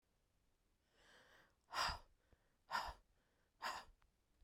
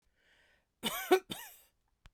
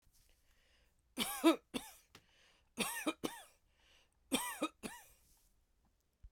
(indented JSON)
{
  "exhalation_length": "4.4 s",
  "exhalation_amplitude": 1182,
  "exhalation_signal_mean_std_ratio": 0.34,
  "cough_length": "2.1 s",
  "cough_amplitude": 7649,
  "cough_signal_mean_std_ratio": 0.27,
  "three_cough_length": "6.3 s",
  "three_cough_amplitude": 4900,
  "three_cough_signal_mean_std_ratio": 0.31,
  "survey_phase": "beta (2021-08-13 to 2022-03-07)",
  "age": "45-64",
  "gender": "Female",
  "wearing_mask": "No",
  "symptom_runny_or_blocked_nose": true,
  "symptom_shortness_of_breath": true,
  "symptom_fatigue": true,
  "symptom_onset": "12 days",
  "smoker_status": "Never smoked",
  "respiratory_condition_asthma": true,
  "respiratory_condition_other": false,
  "recruitment_source": "REACT",
  "submission_delay": "2 days",
  "covid_test_result": "Negative",
  "covid_test_method": "RT-qPCR"
}